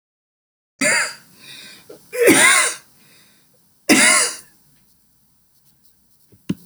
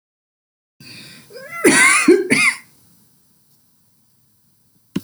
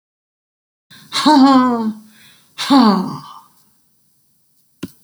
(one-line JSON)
{"three_cough_length": "6.7 s", "three_cough_amplitude": 32768, "three_cough_signal_mean_std_ratio": 0.38, "cough_length": "5.0 s", "cough_amplitude": 32767, "cough_signal_mean_std_ratio": 0.37, "exhalation_length": "5.0 s", "exhalation_amplitude": 30724, "exhalation_signal_mean_std_ratio": 0.43, "survey_phase": "alpha (2021-03-01 to 2021-08-12)", "age": "65+", "gender": "Female", "wearing_mask": "No", "symptom_cough_any": true, "symptom_fatigue": true, "smoker_status": "Never smoked", "respiratory_condition_asthma": true, "respiratory_condition_other": false, "recruitment_source": "REACT", "submission_delay": "3 days", "covid_test_result": "Negative", "covid_test_method": "RT-qPCR"}